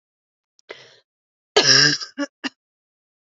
{
  "three_cough_length": "3.3 s",
  "three_cough_amplitude": 29606,
  "three_cough_signal_mean_std_ratio": 0.3,
  "survey_phase": "beta (2021-08-13 to 2022-03-07)",
  "age": "45-64",
  "gender": "Female",
  "wearing_mask": "No",
  "symptom_new_continuous_cough": true,
  "symptom_runny_or_blocked_nose": true,
  "symptom_shortness_of_breath": true,
  "symptom_sore_throat": true,
  "symptom_abdominal_pain": true,
  "symptom_fatigue": true,
  "symptom_fever_high_temperature": true,
  "symptom_headache": true,
  "symptom_onset": "2 days",
  "smoker_status": "Never smoked",
  "respiratory_condition_asthma": false,
  "respiratory_condition_other": false,
  "recruitment_source": "Test and Trace",
  "submission_delay": "2 days",
  "covid_test_result": "Positive",
  "covid_test_method": "RT-qPCR",
  "covid_ct_value": 27.8,
  "covid_ct_gene": "ORF1ab gene",
  "covid_ct_mean": 28.0,
  "covid_viral_load": "630 copies/ml",
  "covid_viral_load_category": "Minimal viral load (< 10K copies/ml)"
}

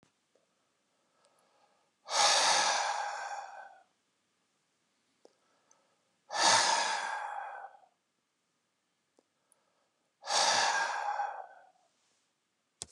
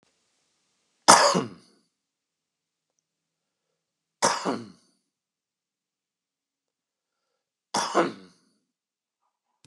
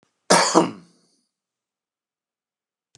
{
  "exhalation_length": "12.9 s",
  "exhalation_amplitude": 7928,
  "exhalation_signal_mean_std_ratio": 0.42,
  "three_cough_length": "9.7 s",
  "three_cough_amplitude": 32768,
  "three_cough_signal_mean_std_ratio": 0.22,
  "cough_length": "3.0 s",
  "cough_amplitude": 30444,
  "cough_signal_mean_std_ratio": 0.27,
  "survey_phase": "beta (2021-08-13 to 2022-03-07)",
  "age": "45-64",
  "gender": "Male",
  "wearing_mask": "No",
  "symptom_none": true,
  "smoker_status": "Ex-smoker",
  "respiratory_condition_asthma": false,
  "respiratory_condition_other": false,
  "recruitment_source": "REACT",
  "submission_delay": "3 days",
  "covid_test_result": "Negative",
  "covid_test_method": "RT-qPCR",
  "influenza_a_test_result": "Negative",
  "influenza_b_test_result": "Negative"
}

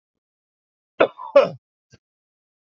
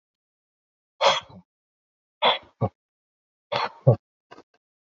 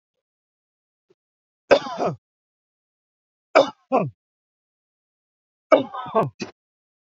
{
  "cough_length": "2.7 s",
  "cough_amplitude": 26513,
  "cough_signal_mean_std_ratio": 0.21,
  "exhalation_length": "4.9 s",
  "exhalation_amplitude": 24558,
  "exhalation_signal_mean_std_ratio": 0.26,
  "three_cough_length": "7.1 s",
  "three_cough_amplitude": 28187,
  "three_cough_signal_mean_std_ratio": 0.25,
  "survey_phase": "beta (2021-08-13 to 2022-03-07)",
  "age": "45-64",
  "gender": "Male",
  "wearing_mask": "No",
  "symptom_none": true,
  "smoker_status": "Current smoker (1 to 10 cigarettes per day)",
  "respiratory_condition_asthma": false,
  "respiratory_condition_other": false,
  "recruitment_source": "REACT",
  "submission_delay": "1 day",
  "covid_test_result": "Negative",
  "covid_test_method": "RT-qPCR",
  "influenza_a_test_result": "Negative",
  "influenza_b_test_result": "Negative"
}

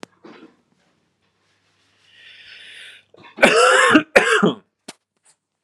{
  "cough_length": "5.6 s",
  "cough_amplitude": 32768,
  "cough_signal_mean_std_ratio": 0.35,
  "survey_phase": "alpha (2021-03-01 to 2021-08-12)",
  "age": "18-44",
  "gender": "Male",
  "wearing_mask": "No",
  "symptom_cough_any": true,
  "symptom_onset": "1 day",
  "smoker_status": "Ex-smoker",
  "respiratory_condition_asthma": false,
  "respiratory_condition_other": false,
  "recruitment_source": "Test and Trace",
  "submission_delay": "0 days",
  "covid_test_result": "Negative",
  "covid_test_method": "RT-qPCR"
}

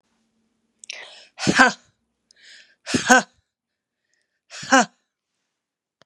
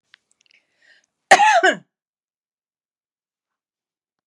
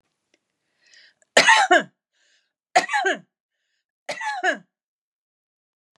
{
  "exhalation_length": "6.1 s",
  "exhalation_amplitude": 32767,
  "exhalation_signal_mean_std_ratio": 0.25,
  "cough_length": "4.3 s",
  "cough_amplitude": 32768,
  "cough_signal_mean_std_ratio": 0.24,
  "three_cough_length": "6.0 s",
  "three_cough_amplitude": 32768,
  "three_cough_signal_mean_std_ratio": 0.31,
  "survey_phase": "beta (2021-08-13 to 2022-03-07)",
  "age": "65+",
  "gender": "Female",
  "wearing_mask": "No",
  "symptom_none": true,
  "smoker_status": "Ex-smoker",
  "respiratory_condition_asthma": true,
  "respiratory_condition_other": false,
  "recruitment_source": "REACT",
  "submission_delay": "1 day",
  "covid_test_result": "Negative",
  "covid_test_method": "RT-qPCR",
  "influenza_a_test_result": "Negative",
  "influenza_b_test_result": "Negative"
}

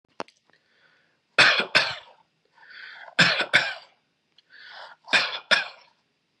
{
  "three_cough_length": "6.4 s",
  "three_cough_amplitude": 27701,
  "three_cough_signal_mean_std_ratio": 0.35,
  "survey_phase": "beta (2021-08-13 to 2022-03-07)",
  "age": "18-44",
  "gender": "Male",
  "wearing_mask": "No",
  "symptom_cough_any": true,
  "symptom_runny_or_blocked_nose": true,
  "symptom_change_to_sense_of_smell_or_taste": true,
  "symptom_onset": "5 days",
  "smoker_status": "Never smoked",
  "respiratory_condition_asthma": false,
  "respiratory_condition_other": false,
  "recruitment_source": "Test and Trace",
  "submission_delay": "2 days",
  "covid_test_result": "Positive",
  "covid_test_method": "RT-qPCR",
  "covid_ct_value": 23.6,
  "covid_ct_gene": "ORF1ab gene",
  "covid_ct_mean": 23.9,
  "covid_viral_load": "14000 copies/ml",
  "covid_viral_load_category": "Low viral load (10K-1M copies/ml)"
}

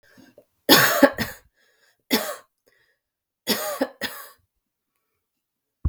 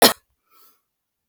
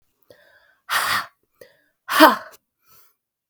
{
  "three_cough_length": "5.9 s",
  "three_cough_amplitude": 32768,
  "three_cough_signal_mean_std_ratio": 0.3,
  "cough_length": "1.3 s",
  "cough_amplitude": 32768,
  "cough_signal_mean_std_ratio": 0.21,
  "exhalation_length": "3.5 s",
  "exhalation_amplitude": 32768,
  "exhalation_signal_mean_std_ratio": 0.28,
  "survey_phase": "beta (2021-08-13 to 2022-03-07)",
  "age": "45-64",
  "gender": "Female",
  "wearing_mask": "No",
  "symptom_cough_any": true,
  "symptom_runny_or_blocked_nose": true,
  "symptom_diarrhoea": true,
  "symptom_fatigue": true,
  "symptom_onset": "3 days",
  "smoker_status": "Never smoked",
  "respiratory_condition_asthma": false,
  "respiratory_condition_other": false,
  "recruitment_source": "Test and Trace",
  "submission_delay": "1 day",
  "covid_test_result": "Positive",
  "covid_test_method": "ePCR"
}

